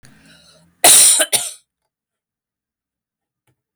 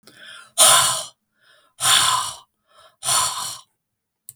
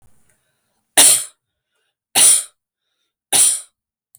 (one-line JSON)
{"cough_length": "3.8 s", "cough_amplitude": 32768, "cough_signal_mean_std_ratio": 0.31, "exhalation_length": "4.4 s", "exhalation_amplitude": 32768, "exhalation_signal_mean_std_ratio": 0.44, "three_cough_length": "4.2 s", "three_cough_amplitude": 32768, "three_cough_signal_mean_std_ratio": 0.35, "survey_phase": "beta (2021-08-13 to 2022-03-07)", "age": "65+", "gender": "Female", "wearing_mask": "No", "symptom_none": true, "symptom_onset": "4 days", "smoker_status": "Never smoked", "respiratory_condition_asthma": false, "respiratory_condition_other": false, "recruitment_source": "REACT", "submission_delay": "1 day", "covid_test_result": "Negative", "covid_test_method": "RT-qPCR"}